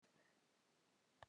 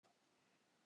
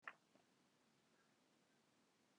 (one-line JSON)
{"three_cough_length": "1.3 s", "three_cough_amplitude": 263, "three_cough_signal_mean_std_ratio": 0.48, "cough_length": "0.9 s", "cough_amplitude": 28, "cough_signal_mean_std_ratio": 1.03, "exhalation_length": "2.4 s", "exhalation_amplitude": 537, "exhalation_signal_mean_std_ratio": 0.32, "survey_phase": "beta (2021-08-13 to 2022-03-07)", "age": "45-64", "gender": "Female", "wearing_mask": "No", "symptom_none": true, "symptom_onset": "2 days", "smoker_status": "Ex-smoker", "respiratory_condition_asthma": false, "respiratory_condition_other": false, "recruitment_source": "REACT", "submission_delay": "3 days", "covid_test_result": "Negative", "covid_test_method": "RT-qPCR"}